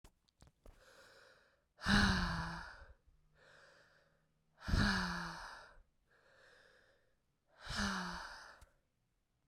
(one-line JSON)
{"exhalation_length": "9.5 s", "exhalation_amplitude": 3991, "exhalation_signal_mean_std_ratio": 0.39, "survey_phase": "beta (2021-08-13 to 2022-03-07)", "age": "18-44", "gender": "Female", "wearing_mask": "No", "symptom_cough_any": true, "symptom_runny_or_blocked_nose": true, "symptom_shortness_of_breath": true, "symptom_abdominal_pain": true, "symptom_fatigue": true, "symptom_headache": true, "symptom_change_to_sense_of_smell_or_taste": true, "symptom_loss_of_taste": true, "symptom_onset": "4 days", "smoker_status": "Current smoker (1 to 10 cigarettes per day)", "respiratory_condition_asthma": false, "respiratory_condition_other": false, "recruitment_source": "Test and Trace", "submission_delay": "2 days", "covid_test_result": "Positive", "covid_test_method": "RT-qPCR", "covid_ct_value": 16.2, "covid_ct_gene": "ORF1ab gene", "covid_ct_mean": 16.4, "covid_viral_load": "4000000 copies/ml", "covid_viral_load_category": "High viral load (>1M copies/ml)"}